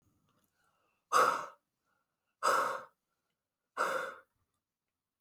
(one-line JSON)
{"exhalation_length": "5.2 s", "exhalation_amplitude": 5983, "exhalation_signal_mean_std_ratio": 0.34, "survey_phase": "beta (2021-08-13 to 2022-03-07)", "age": "45-64", "gender": "Female", "wearing_mask": "No", "symptom_cough_any": true, "symptom_runny_or_blocked_nose": true, "symptom_fatigue": true, "symptom_headache": true, "symptom_onset": "3 days", "smoker_status": "Never smoked", "respiratory_condition_asthma": false, "respiratory_condition_other": false, "recruitment_source": "Test and Trace", "submission_delay": "2 days", "covid_test_result": "Positive", "covid_test_method": "ePCR"}